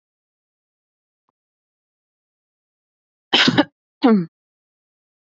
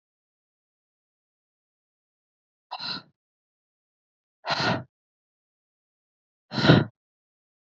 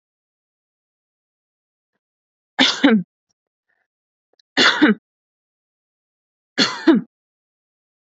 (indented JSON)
{
  "cough_length": "5.3 s",
  "cough_amplitude": 29089,
  "cough_signal_mean_std_ratio": 0.24,
  "exhalation_length": "7.8 s",
  "exhalation_amplitude": 22513,
  "exhalation_signal_mean_std_ratio": 0.21,
  "three_cough_length": "8.0 s",
  "three_cough_amplitude": 29863,
  "three_cough_signal_mean_std_ratio": 0.28,
  "survey_phase": "beta (2021-08-13 to 2022-03-07)",
  "age": "18-44",
  "gender": "Female",
  "wearing_mask": "No",
  "symptom_none": true,
  "smoker_status": "Never smoked",
  "respiratory_condition_asthma": false,
  "respiratory_condition_other": false,
  "recruitment_source": "REACT",
  "submission_delay": "2 days",
  "covid_test_result": "Negative",
  "covid_test_method": "RT-qPCR",
  "influenza_a_test_result": "Negative",
  "influenza_b_test_result": "Negative"
}